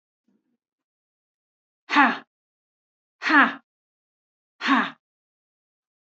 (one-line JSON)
{"exhalation_length": "6.1 s", "exhalation_amplitude": 26490, "exhalation_signal_mean_std_ratio": 0.26, "survey_phase": "beta (2021-08-13 to 2022-03-07)", "age": "18-44", "gender": "Female", "wearing_mask": "No", "symptom_none": true, "smoker_status": "Never smoked", "respiratory_condition_asthma": false, "respiratory_condition_other": false, "recruitment_source": "REACT", "submission_delay": "1 day", "covid_test_result": "Negative", "covid_test_method": "RT-qPCR", "influenza_a_test_result": "Negative", "influenza_b_test_result": "Negative"}